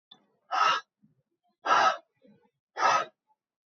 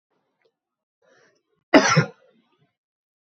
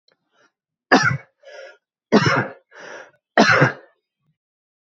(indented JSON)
{
  "exhalation_length": "3.7 s",
  "exhalation_amplitude": 10497,
  "exhalation_signal_mean_std_ratio": 0.39,
  "cough_length": "3.2 s",
  "cough_amplitude": 32767,
  "cough_signal_mean_std_ratio": 0.23,
  "three_cough_length": "4.9 s",
  "three_cough_amplitude": 30117,
  "three_cough_signal_mean_std_ratio": 0.35,
  "survey_phase": "beta (2021-08-13 to 2022-03-07)",
  "age": "18-44",
  "gender": "Male",
  "wearing_mask": "No",
  "symptom_cough_any": true,
  "symptom_new_continuous_cough": true,
  "symptom_runny_or_blocked_nose": true,
  "symptom_fever_high_temperature": true,
  "symptom_change_to_sense_of_smell_or_taste": true,
  "symptom_loss_of_taste": true,
  "symptom_onset": "3 days",
  "smoker_status": "Never smoked",
  "respiratory_condition_asthma": false,
  "respiratory_condition_other": false,
  "recruitment_source": "Test and Trace",
  "submission_delay": "2 days",
  "covid_test_result": "Positive",
  "covid_test_method": "ePCR"
}